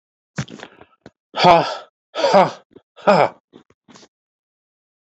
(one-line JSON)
{"exhalation_length": "5.0 s", "exhalation_amplitude": 27855, "exhalation_signal_mean_std_ratio": 0.33, "survey_phase": "beta (2021-08-13 to 2022-03-07)", "age": "65+", "gender": "Male", "wearing_mask": "No", "symptom_none": true, "smoker_status": "Ex-smoker", "respiratory_condition_asthma": false, "respiratory_condition_other": false, "recruitment_source": "REACT", "submission_delay": "1 day", "covid_test_result": "Negative", "covid_test_method": "RT-qPCR"}